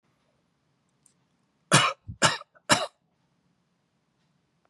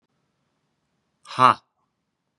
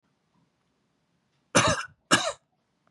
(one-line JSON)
{"three_cough_length": "4.7 s", "three_cough_amplitude": 24229, "three_cough_signal_mean_std_ratio": 0.24, "exhalation_length": "2.4 s", "exhalation_amplitude": 27272, "exhalation_signal_mean_std_ratio": 0.17, "cough_length": "2.9 s", "cough_amplitude": 18535, "cough_signal_mean_std_ratio": 0.3, "survey_phase": "beta (2021-08-13 to 2022-03-07)", "age": "45-64", "gender": "Male", "wearing_mask": "No", "symptom_runny_or_blocked_nose": true, "symptom_fever_high_temperature": true, "symptom_onset": "4 days", "smoker_status": "Ex-smoker", "respiratory_condition_asthma": false, "respiratory_condition_other": false, "recruitment_source": "Test and Trace", "submission_delay": "1 day", "covid_test_result": "Positive", "covid_test_method": "RT-qPCR", "covid_ct_value": 15.2, "covid_ct_gene": "ORF1ab gene", "covid_ct_mean": 15.4, "covid_viral_load": "9200000 copies/ml", "covid_viral_load_category": "High viral load (>1M copies/ml)"}